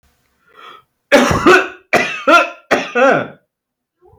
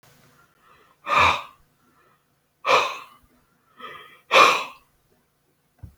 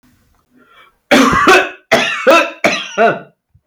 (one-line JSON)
{"three_cough_length": "4.2 s", "three_cough_amplitude": 31102, "three_cough_signal_mean_std_ratio": 0.48, "exhalation_length": "6.0 s", "exhalation_amplitude": 27446, "exhalation_signal_mean_std_ratio": 0.31, "cough_length": "3.7 s", "cough_amplitude": 32768, "cough_signal_mean_std_ratio": 0.56, "survey_phase": "alpha (2021-03-01 to 2021-08-12)", "age": "65+", "gender": "Male", "wearing_mask": "No", "symptom_none": true, "smoker_status": "Never smoked", "respiratory_condition_asthma": false, "respiratory_condition_other": false, "recruitment_source": "REACT", "submission_delay": "3 days", "covid_test_result": "Negative", "covid_test_method": "RT-qPCR"}